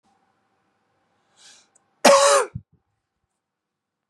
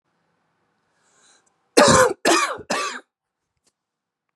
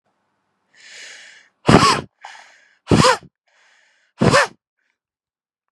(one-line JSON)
{"cough_length": "4.1 s", "cough_amplitude": 30654, "cough_signal_mean_std_ratio": 0.26, "three_cough_length": "4.4 s", "three_cough_amplitude": 32740, "three_cough_signal_mean_std_ratio": 0.33, "exhalation_length": "5.7 s", "exhalation_amplitude": 32768, "exhalation_signal_mean_std_ratio": 0.31, "survey_phase": "beta (2021-08-13 to 2022-03-07)", "age": "18-44", "gender": "Male", "wearing_mask": "No", "symptom_cough_any": true, "symptom_runny_or_blocked_nose": true, "symptom_sore_throat": true, "symptom_abdominal_pain": true, "symptom_fatigue": true, "symptom_headache": true, "symptom_other": true, "symptom_onset": "3 days", "smoker_status": "Never smoked", "respiratory_condition_asthma": false, "respiratory_condition_other": false, "recruitment_source": "Test and Trace", "submission_delay": "2 days", "covid_test_result": "Positive", "covid_test_method": "RT-qPCR", "covid_ct_value": 17.9, "covid_ct_gene": "ORF1ab gene", "covid_ct_mean": 18.3, "covid_viral_load": "990000 copies/ml", "covid_viral_load_category": "Low viral load (10K-1M copies/ml)"}